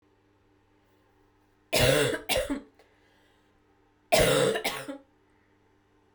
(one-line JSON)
{"three_cough_length": "6.1 s", "three_cough_amplitude": 11849, "three_cough_signal_mean_std_ratio": 0.39, "survey_phase": "beta (2021-08-13 to 2022-03-07)", "age": "18-44", "gender": "Female", "wearing_mask": "No", "symptom_cough_any": true, "symptom_new_continuous_cough": true, "symptom_runny_or_blocked_nose": true, "symptom_diarrhoea": true, "symptom_fever_high_temperature": true, "symptom_headache": true, "symptom_onset": "4 days", "smoker_status": "Never smoked", "respiratory_condition_asthma": false, "respiratory_condition_other": false, "recruitment_source": "Test and Trace", "submission_delay": "2 days", "covid_test_result": "Positive", "covid_test_method": "RT-qPCR"}